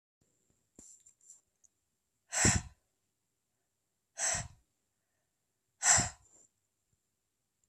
{
  "exhalation_length": "7.7 s",
  "exhalation_amplitude": 8990,
  "exhalation_signal_mean_std_ratio": 0.24,
  "survey_phase": "beta (2021-08-13 to 2022-03-07)",
  "age": "18-44",
  "gender": "Female",
  "wearing_mask": "No",
  "symptom_cough_any": true,
  "symptom_runny_or_blocked_nose": true,
  "symptom_sore_throat": true,
  "symptom_fatigue": true,
  "symptom_fever_high_temperature": true,
  "symptom_headache": true,
  "symptom_onset": "3 days",
  "smoker_status": "Never smoked",
  "respiratory_condition_asthma": false,
  "respiratory_condition_other": false,
  "recruitment_source": "Test and Trace",
  "submission_delay": "1 day",
  "covid_test_result": "Positive",
  "covid_test_method": "ePCR"
}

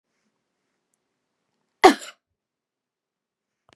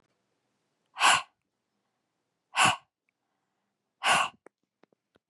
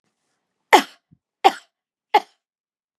{
  "cough_length": "3.8 s",
  "cough_amplitude": 32767,
  "cough_signal_mean_std_ratio": 0.13,
  "exhalation_length": "5.3 s",
  "exhalation_amplitude": 12110,
  "exhalation_signal_mean_std_ratio": 0.27,
  "three_cough_length": "3.0 s",
  "three_cough_amplitude": 32768,
  "three_cough_signal_mean_std_ratio": 0.2,
  "survey_phase": "beta (2021-08-13 to 2022-03-07)",
  "age": "45-64",
  "gender": "Female",
  "wearing_mask": "No",
  "symptom_none": true,
  "symptom_onset": "12 days",
  "smoker_status": "Ex-smoker",
  "respiratory_condition_asthma": false,
  "respiratory_condition_other": false,
  "recruitment_source": "REACT",
  "submission_delay": "1 day",
  "covid_test_result": "Negative",
  "covid_test_method": "RT-qPCR",
  "influenza_a_test_result": "Negative",
  "influenza_b_test_result": "Negative"
}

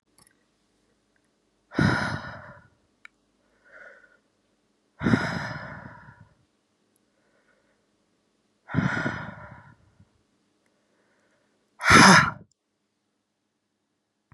{
  "exhalation_length": "14.3 s",
  "exhalation_amplitude": 28389,
  "exhalation_signal_mean_std_ratio": 0.25,
  "survey_phase": "beta (2021-08-13 to 2022-03-07)",
  "age": "45-64",
  "gender": "Female",
  "wearing_mask": "No",
  "symptom_runny_or_blocked_nose": true,
  "symptom_sore_throat": true,
  "symptom_headache": true,
  "smoker_status": "Ex-smoker",
  "respiratory_condition_asthma": false,
  "respiratory_condition_other": false,
  "recruitment_source": "REACT",
  "submission_delay": "1 day",
  "covid_test_result": "Negative",
  "covid_test_method": "RT-qPCR",
  "influenza_a_test_result": "Negative",
  "influenza_b_test_result": "Negative"
}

